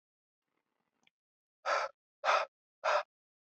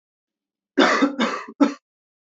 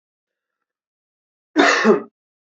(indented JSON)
{
  "exhalation_length": "3.6 s",
  "exhalation_amplitude": 5321,
  "exhalation_signal_mean_std_ratio": 0.33,
  "three_cough_length": "2.4 s",
  "three_cough_amplitude": 26025,
  "three_cough_signal_mean_std_ratio": 0.41,
  "cough_length": "2.5 s",
  "cough_amplitude": 27746,
  "cough_signal_mean_std_ratio": 0.34,
  "survey_phase": "beta (2021-08-13 to 2022-03-07)",
  "age": "18-44",
  "gender": "Male",
  "wearing_mask": "No",
  "symptom_cough_any": true,
  "symptom_runny_or_blocked_nose": true,
  "symptom_sore_throat": true,
  "symptom_fatigue": true,
  "symptom_fever_high_temperature": true,
  "smoker_status": "Never smoked",
  "respiratory_condition_asthma": false,
  "respiratory_condition_other": false,
  "recruitment_source": "Test and Trace",
  "submission_delay": "1 day",
  "covid_test_result": "Positive",
  "covid_test_method": "LFT"
}